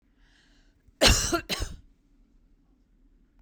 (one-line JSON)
{"cough_length": "3.4 s", "cough_amplitude": 17537, "cough_signal_mean_std_ratio": 0.3, "survey_phase": "beta (2021-08-13 to 2022-03-07)", "age": "65+", "gender": "Female", "wearing_mask": "No", "symptom_none": true, "smoker_status": "Never smoked", "respiratory_condition_asthma": false, "respiratory_condition_other": false, "recruitment_source": "REACT", "submission_delay": "2 days", "covid_test_result": "Negative", "covid_test_method": "RT-qPCR", "influenza_a_test_result": "Negative", "influenza_b_test_result": "Negative"}